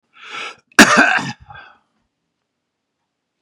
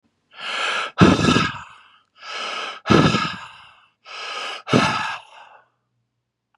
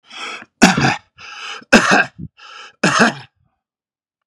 {
  "cough_length": "3.4 s",
  "cough_amplitude": 32768,
  "cough_signal_mean_std_ratio": 0.29,
  "exhalation_length": "6.6 s",
  "exhalation_amplitude": 32221,
  "exhalation_signal_mean_std_ratio": 0.46,
  "three_cough_length": "4.3 s",
  "three_cough_amplitude": 32768,
  "three_cough_signal_mean_std_ratio": 0.41,
  "survey_phase": "beta (2021-08-13 to 2022-03-07)",
  "age": "65+",
  "gender": "Male",
  "wearing_mask": "No",
  "symptom_cough_any": true,
  "symptom_loss_of_taste": true,
  "symptom_onset": "12 days",
  "smoker_status": "Current smoker (e-cigarettes or vapes only)",
  "respiratory_condition_asthma": false,
  "respiratory_condition_other": false,
  "recruitment_source": "REACT",
  "submission_delay": "1 day",
  "covid_test_result": "Positive",
  "covid_test_method": "RT-qPCR",
  "covid_ct_value": 29.0,
  "covid_ct_gene": "E gene",
  "influenza_a_test_result": "Negative",
  "influenza_b_test_result": "Negative"
}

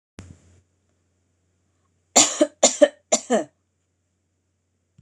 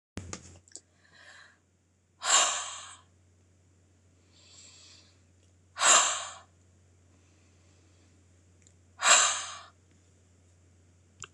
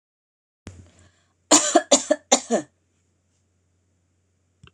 {
  "three_cough_length": "5.0 s",
  "three_cough_amplitude": 26028,
  "three_cough_signal_mean_std_ratio": 0.25,
  "exhalation_length": "11.3 s",
  "exhalation_amplitude": 15719,
  "exhalation_signal_mean_std_ratio": 0.28,
  "cough_length": "4.7 s",
  "cough_amplitude": 26027,
  "cough_signal_mean_std_ratio": 0.26,
  "survey_phase": "alpha (2021-03-01 to 2021-08-12)",
  "age": "45-64",
  "gender": "Female",
  "wearing_mask": "No",
  "symptom_none": true,
  "smoker_status": "Never smoked",
  "respiratory_condition_asthma": false,
  "respiratory_condition_other": false,
  "recruitment_source": "REACT",
  "submission_delay": "8 days",
  "covid_test_result": "Negative",
  "covid_test_method": "RT-qPCR"
}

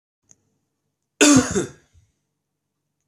{
  "cough_length": "3.1 s",
  "cough_amplitude": 26575,
  "cough_signal_mean_std_ratio": 0.28,
  "survey_phase": "beta (2021-08-13 to 2022-03-07)",
  "age": "45-64",
  "gender": "Male",
  "wearing_mask": "No",
  "symptom_none": true,
  "smoker_status": "Never smoked",
  "respiratory_condition_asthma": false,
  "respiratory_condition_other": false,
  "recruitment_source": "REACT",
  "submission_delay": "3 days",
  "covid_test_result": "Negative",
  "covid_test_method": "RT-qPCR",
  "influenza_a_test_result": "Unknown/Void",
  "influenza_b_test_result": "Unknown/Void"
}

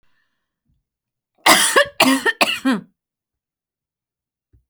{
  "cough_length": "4.7 s",
  "cough_amplitude": 32767,
  "cough_signal_mean_std_ratio": 0.35,
  "survey_phase": "alpha (2021-03-01 to 2021-08-12)",
  "age": "45-64",
  "gender": "Female",
  "wearing_mask": "No",
  "symptom_none": true,
  "smoker_status": "Never smoked",
  "respiratory_condition_asthma": false,
  "respiratory_condition_other": false,
  "recruitment_source": "REACT",
  "submission_delay": "1 day",
  "covid_test_result": "Negative",
  "covid_test_method": "RT-qPCR"
}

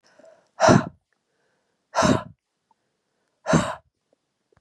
{
  "exhalation_length": "4.6 s",
  "exhalation_amplitude": 28909,
  "exhalation_signal_mean_std_ratio": 0.3,
  "survey_phase": "beta (2021-08-13 to 2022-03-07)",
  "age": "65+",
  "gender": "Female",
  "wearing_mask": "No",
  "symptom_none": true,
  "symptom_onset": "8 days",
  "smoker_status": "Never smoked",
  "respiratory_condition_asthma": false,
  "respiratory_condition_other": false,
  "recruitment_source": "REACT",
  "submission_delay": "1 day",
  "covid_test_result": "Positive",
  "covid_test_method": "RT-qPCR",
  "covid_ct_value": 24.5,
  "covid_ct_gene": "E gene",
  "influenza_a_test_result": "Negative",
  "influenza_b_test_result": "Negative"
}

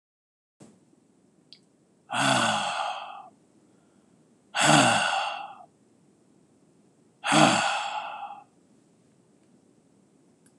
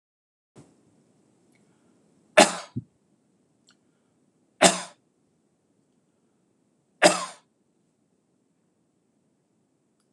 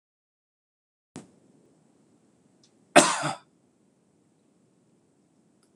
{
  "exhalation_length": "10.6 s",
  "exhalation_amplitude": 20338,
  "exhalation_signal_mean_std_ratio": 0.39,
  "three_cough_length": "10.1 s",
  "three_cough_amplitude": 26028,
  "three_cough_signal_mean_std_ratio": 0.16,
  "cough_length": "5.8 s",
  "cough_amplitude": 26027,
  "cough_signal_mean_std_ratio": 0.16,
  "survey_phase": "alpha (2021-03-01 to 2021-08-12)",
  "age": "45-64",
  "gender": "Male",
  "wearing_mask": "No",
  "symptom_none": true,
  "smoker_status": "Never smoked",
  "respiratory_condition_asthma": false,
  "respiratory_condition_other": false,
  "recruitment_source": "REACT",
  "submission_delay": "2 days",
  "covid_test_result": "Negative",
  "covid_test_method": "RT-qPCR"
}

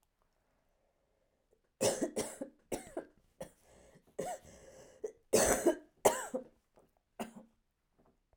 {
  "cough_length": "8.4 s",
  "cough_amplitude": 8738,
  "cough_signal_mean_std_ratio": 0.32,
  "survey_phase": "beta (2021-08-13 to 2022-03-07)",
  "age": "45-64",
  "gender": "Female",
  "wearing_mask": "No",
  "symptom_cough_any": true,
  "symptom_sore_throat": true,
  "symptom_fatigue": true,
  "symptom_onset": "3 days",
  "smoker_status": "Never smoked",
  "respiratory_condition_asthma": false,
  "respiratory_condition_other": false,
  "recruitment_source": "Test and Trace",
  "submission_delay": "1 day",
  "covid_test_result": "Positive",
  "covid_test_method": "ePCR"
}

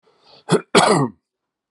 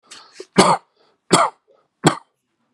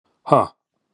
{
  "cough_length": "1.7 s",
  "cough_amplitude": 32350,
  "cough_signal_mean_std_ratio": 0.4,
  "three_cough_length": "2.7 s",
  "three_cough_amplitude": 32768,
  "three_cough_signal_mean_std_ratio": 0.32,
  "exhalation_length": "0.9 s",
  "exhalation_amplitude": 32052,
  "exhalation_signal_mean_std_ratio": 0.29,
  "survey_phase": "beta (2021-08-13 to 2022-03-07)",
  "age": "65+",
  "gender": "Male",
  "wearing_mask": "No",
  "symptom_fatigue": true,
  "symptom_onset": "12 days",
  "smoker_status": "Never smoked",
  "respiratory_condition_asthma": false,
  "respiratory_condition_other": false,
  "recruitment_source": "REACT",
  "submission_delay": "2 days",
  "covid_test_result": "Negative",
  "covid_test_method": "RT-qPCR",
  "influenza_a_test_result": "Unknown/Void",
  "influenza_b_test_result": "Unknown/Void"
}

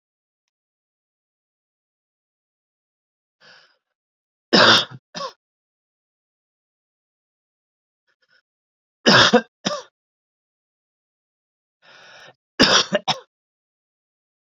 {
  "three_cough_length": "14.5 s",
  "three_cough_amplitude": 32677,
  "three_cough_signal_mean_std_ratio": 0.22,
  "survey_phase": "beta (2021-08-13 to 2022-03-07)",
  "age": "18-44",
  "gender": "Male",
  "wearing_mask": "No",
  "symptom_cough_any": true,
  "symptom_runny_or_blocked_nose": true,
  "symptom_sore_throat": true,
  "symptom_headache": true,
  "symptom_change_to_sense_of_smell_or_taste": true,
  "symptom_loss_of_taste": true,
  "symptom_onset": "4 days",
  "smoker_status": "Ex-smoker",
  "respiratory_condition_asthma": true,
  "respiratory_condition_other": false,
  "recruitment_source": "Test and Trace",
  "submission_delay": "1 day",
  "covid_test_result": "Positive",
  "covid_test_method": "RT-qPCR",
  "covid_ct_value": 19.7,
  "covid_ct_gene": "N gene",
  "covid_ct_mean": 20.3,
  "covid_viral_load": "210000 copies/ml",
  "covid_viral_load_category": "Low viral load (10K-1M copies/ml)"
}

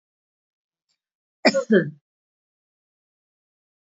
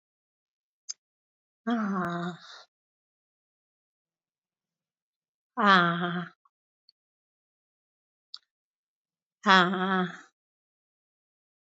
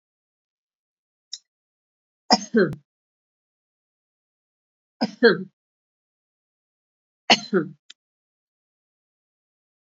{
  "cough_length": "3.9 s",
  "cough_amplitude": 24566,
  "cough_signal_mean_std_ratio": 0.22,
  "exhalation_length": "11.6 s",
  "exhalation_amplitude": 18566,
  "exhalation_signal_mean_std_ratio": 0.28,
  "three_cough_length": "9.9 s",
  "three_cough_amplitude": 27287,
  "three_cough_signal_mean_std_ratio": 0.2,
  "survey_phase": "beta (2021-08-13 to 2022-03-07)",
  "age": "45-64",
  "gender": "Female",
  "wearing_mask": "No",
  "symptom_none": true,
  "smoker_status": "Never smoked",
  "respiratory_condition_asthma": false,
  "respiratory_condition_other": false,
  "recruitment_source": "REACT",
  "submission_delay": "1 day",
  "covid_test_result": "Negative",
  "covid_test_method": "RT-qPCR"
}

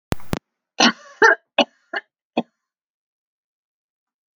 {
  "cough_length": "4.4 s",
  "cough_amplitude": 29729,
  "cough_signal_mean_std_ratio": 0.27,
  "survey_phase": "alpha (2021-03-01 to 2021-08-12)",
  "age": "65+",
  "gender": "Female",
  "wearing_mask": "No",
  "symptom_none": true,
  "smoker_status": "Ex-smoker",
  "respiratory_condition_asthma": false,
  "respiratory_condition_other": false,
  "recruitment_source": "REACT",
  "submission_delay": "2 days",
  "covid_test_result": "Negative",
  "covid_test_method": "RT-qPCR"
}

